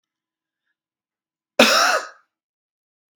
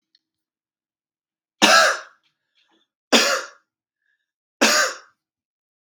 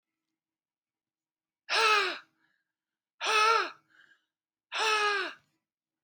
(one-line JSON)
{"cough_length": "3.2 s", "cough_amplitude": 32768, "cough_signal_mean_std_ratio": 0.28, "three_cough_length": "5.9 s", "three_cough_amplitude": 32767, "three_cough_signal_mean_std_ratio": 0.31, "exhalation_length": "6.0 s", "exhalation_amplitude": 9616, "exhalation_signal_mean_std_ratio": 0.4, "survey_phase": "beta (2021-08-13 to 2022-03-07)", "age": "18-44", "gender": "Male", "wearing_mask": "No", "symptom_cough_any": true, "symptom_sore_throat": true, "symptom_onset": "4 days", "smoker_status": "Never smoked", "respiratory_condition_asthma": false, "respiratory_condition_other": false, "recruitment_source": "Test and Trace", "submission_delay": "2 days", "covid_test_result": "Positive", "covid_test_method": "RT-qPCR", "covid_ct_value": 20.0, "covid_ct_gene": "N gene", "covid_ct_mean": 20.2, "covid_viral_load": "230000 copies/ml", "covid_viral_load_category": "Low viral load (10K-1M copies/ml)"}